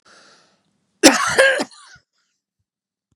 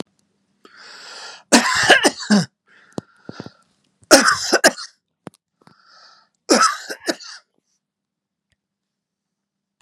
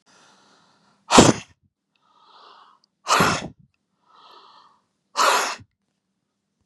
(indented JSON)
{
  "cough_length": "3.2 s",
  "cough_amplitude": 32768,
  "cough_signal_mean_std_ratio": 0.31,
  "three_cough_length": "9.8 s",
  "three_cough_amplitude": 32768,
  "three_cough_signal_mean_std_ratio": 0.32,
  "exhalation_length": "6.7 s",
  "exhalation_amplitude": 32768,
  "exhalation_signal_mean_std_ratio": 0.28,
  "survey_phase": "beta (2021-08-13 to 2022-03-07)",
  "age": "65+",
  "gender": "Male",
  "wearing_mask": "No",
  "symptom_none": true,
  "smoker_status": "Ex-smoker",
  "respiratory_condition_asthma": false,
  "respiratory_condition_other": false,
  "recruitment_source": "REACT",
  "submission_delay": "7 days",
  "covid_test_result": "Negative",
  "covid_test_method": "RT-qPCR",
  "influenza_a_test_result": "Negative",
  "influenza_b_test_result": "Negative"
}